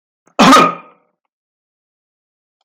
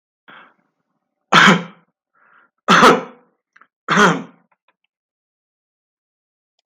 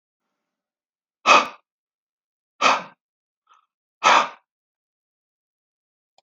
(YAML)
cough_length: 2.6 s
cough_amplitude: 32768
cough_signal_mean_std_ratio: 0.31
three_cough_length: 6.7 s
three_cough_amplitude: 32768
three_cough_signal_mean_std_ratio: 0.3
exhalation_length: 6.2 s
exhalation_amplitude: 32768
exhalation_signal_mean_std_ratio: 0.24
survey_phase: beta (2021-08-13 to 2022-03-07)
age: 65+
gender: Male
wearing_mask: 'No'
symptom_none: true
smoker_status: Ex-smoker
respiratory_condition_asthma: false
respiratory_condition_other: false
recruitment_source: REACT
submission_delay: 3 days
covid_test_result: Negative
covid_test_method: RT-qPCR
influenza_a_test_result: Negative
influenza_b_test_result: Negative